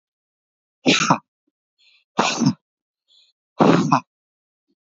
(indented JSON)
{
  "exhalation_length": "4.9 s",
  "exhalation_amplitude": 26729,
  "exhalation_signal_mean_std_ratio": 0.35,
  "survey_phase": "beta (2021-08-13 to 2022-03-07)",
  "age": "18-44",
  "gender": "Male",
  "wearing_mask": "No",
  "symptom_cough_any": true,
  "symptom_runny_or_blocked_nose": true,
  "symptom_sore_throat": true,
  "symptom_fatigue": true,
  "symptom_headache": true,
  "symptom_change_to_sense_of_smell_or_taste": true,
  "symptom_onset": "3 days",
  "smoker_status": "Never smoked",
  "respiratory_condition_asthma": false,
  "respiratory_condition_other": false,
  "recruitment_source": "Test and Trace",
  "submission_delay": "1 day",
  "covid_test_method": "ePCR"
}